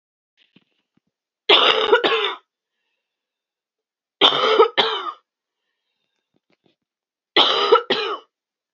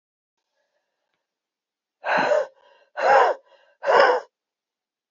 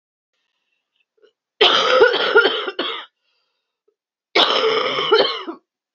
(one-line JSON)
{"three_cough_length": "8.7 s", "three_cough_amplitude": 31594, "three_cough_signal_mean_std_ratio": 0.38, "exhalation_length": "5.1 s", "exhalation_amplitude": 24425, "exhalation_signal_mean_std_ratio": 0.38, "cough_length": "5.9 s", "cough_amplitude": 32768, "cough_signal_mean_std_ratio": 0.49, "survey_phase": "alpha (2021-03-01 to 2021-08-12)", "age": "45-64", "gender": "Female", "wearing_mask": "No", "symptom_cough_any": true, "symptom_diarrhoea": true, "symptom_fatigue": true, "symptom_headache": true, "symptom_change_to_sense_of_smell_or_taste": true, "symptom_loss_of_taste": true, "symptom_onset": "3 days", "smoker_status": "Current smoker (1 to 10 cigarettes per day)", "respiratory_condition_asthma": false, "respiratory_condition_other": false, "recruitment_source": "Test and Trace", "submission_delay": "1 day", "covid_test_result": "Positive", "covid_test_method": "RT-qPCR", "covid_ct_value": 20.1, "covid_ct_gene": "ORF1ab gene", "covid_ct_mean": 21.1, "covid_viral_load": "120000 copies/ml", "covid_viral_load_category": "Low viral load (10K-1M copies/ml)"}